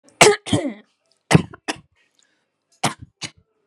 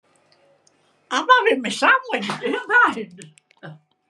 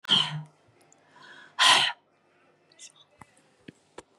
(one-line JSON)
{"three_cough_length": "3.7 s", "three_cough_amplitude": 32768, "three_cough_signal_mean_std_ratio": 0.28, "cough_length": "4.1 s", "cough_amplitude": 27648, "cough_signal_mean_std_ratio": 0.48, "exhalation_length": "4.2 s", "exhalation_amplitude": 16830, "exhalation_signal_mean_std_ratio": 0.31, "survey_phase": "beta (2021-08-13 to 2022-03-07)", "age": "65+", "gender": "Female", "wearing_mask": "No", "symptom_runny_or_blocked_nose": true, "smoker_status": "Never smoked", "respiratory_condition_asthma": false, "respiratory_condition_other": false, "recruitment_source": "REACT", "submission_delay": "0 days", "covid_test_result": "Negative", "covid_test_method": "RT-qPCR", "influenza_a_test_result": "Negative", "influenza_b_test_result": "Negative"}